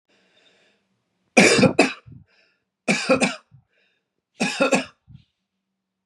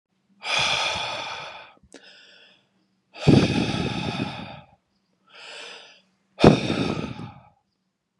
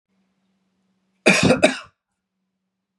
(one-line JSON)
{"three_cough_length": "6.1 s", "three_cough_amplitude": 31731, "three_cough_signal_mean_std_ratio": 0.34, "exhalation_length": "8.2 s", "exhalation_amplitude": 32767, "exhalation_signal_mean_std_ratio": 0.4, "cough_length": "3.0 s", "cough_amplitude": 31853, "cough_signal_mean_std_ratio": 0.29, "survey_phase": "beta (2021-08-13 to 2022-03-07)", "age": "18-44", "gender": "Male", "wearing_mask": "No", "symptom_none": true, "smoker_status": "Never smoked", "respiratory_condition_asthma": false, "respiratory_condition_other": false, "recruitment_source": "REACT", "submission_delay": "3 days", "covid_test_result": "Negative", "covid_test_method": "RT-qPCR", "influenza_a_test_result": "Negative", "influenza_b_test_result": "Negative"}